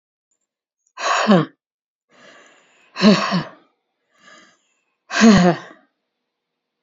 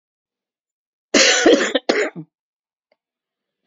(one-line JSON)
{"exhalation_length": "6.8 s", "exhalation_amplitude": 29697, "exhalation_signal_mean_std_ratio": 0.34, "cough_length": "3.7 s", "cough_amplitude": 32058, "cough_signal_mean_std_ratio": 0.37, "survey_phase": "beta (2021-08-13 to 2022-03-07)", "age": "65+", "gender": "Female", "wearing_mask": "No", "symptom_cough_any": true, "symptom_runny_or_blocked_nose": true, "symptom_sore_throat": true, "symptom_other": true, "smoker_status": "Never smoked", "respiratory_condition_asthma": false, "respiratory_condition_other": false, "recruitment_source": "Test and Trace", "submission_delay": "2 days", "covid_test_result": "Positive", "covid_test_method": "RT-qPCR", "covid_ct_value": 31.7, "covid_ct_gene": "ORF1ab gene"}